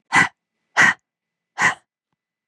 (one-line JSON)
{"exhalation_length": "2.5 s", "exhalation_amplitude": 27161, "exhalation_signal_mean_std_ratio": 0.34, "survey_phase": "beta (2021-08-13 to 2022-03-07)", "age": "45-64", "gender": "Female", "wearing_mask": "No", "symptom_cough_any": true, "symptom_shortness_of_breath": true, "symptom_sore_throat": true, "symptom_fatigue": true, "symptom_change_to_sense_of_smell_or_taste": true, "smoker_status": "Ex-smoker", "respiratory_condition_asthma": false, "respiratory_condition_other": false, "recruitment_source": "Test and Trace", "submission_delay": "1 day", "covid_test_result": "Positive", "covid_test_method": "LFT"}